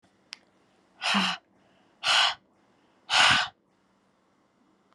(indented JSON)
{
  "exhalation_length": "4.9 s",
  "exhalation_amplitude": 14279,
  "exhalation_signal_mean_std_ratio": 0.36,
  "survey_phase": "beta (2021-08-13 to 2022-03-07)",
  "age": "45-64",
  "gender": "Female",
  "wearing_mask": "No",
  "symptom_fatigue": true,
  "symptom_headache": true,
  "symptom_change_to_sense_of_smell_or_taste": true,
  "symptom_onset": "5 days",
  "smoker_status": "Never smoked",
  "respiratory_condition_asthma": false,
  "respiratory_condition_other": false,
  "recruitment_source": "Test and Trace",
  "submission_delay": "2 days",
  "covid_test_result": "Positive",
  "covid_test_method": "RT-qPCR"
}